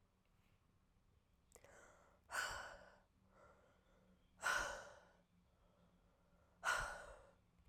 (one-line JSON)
{"exhalation_length": "7.7 s", "exhalation_amplitude": 1217, "exhalation_signal_mean_std_ratio": 0.36, "survey_phase": "alpha (2021-03-01 to 2021-08-12)", "age": "18-44", "gender": "Female", "wearing_mask": "No", "symptom_fever_high_temperature": true, "symptom_headache": true, "symptom_loss_of_taste": true, "symptom_onset": "2 days", "smoker_status": "Never smoked", "respiratory_condition_asthma": false, "respiratory_condition_other": false, "recruitment_source": "Test and Trace", "submission_delay": "2 days", "covid_test_result": "Positive", "covid_test_method": "RT-qPCR", "covid_ct_value": 22.5, "covid_ct_gene": "ORF1ab gene"}